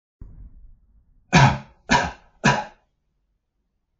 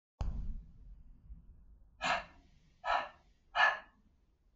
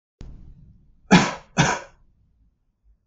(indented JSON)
{
  "three_cough_length": "4.0 s",
  "three_cough_amplitude": 26213,
  "three_cough_signal_mean_std_ratio": 0.31,
  "exhalation_length": "4.6 s",
  "exhalation_amplitude": 5475,
  "exhalation_signal_mean_std_ratio": 0.41,
  "cough_length": "3.1 s",
  "cough_amplitude": 30519,
  "cough_signal_mean_std_ratio": 0.29,
  "survey_phase": "alpha (2021-03-01 to 2021-08-12)",
  "age": "45-64",
  "gender": "Male",
  "wearing_mask": "No",
  "symptom_none": true,
  "smoker_status": "Never smoked",
  "respiratory_condition_asthma": false,
  "respiratory_condition_other": false,
  "recruitment_source": "REACT",
  "submission_delay": "3 days",
  "covid_test_result": "Negative",
  "covid_test_method": "RT-qPCR"
}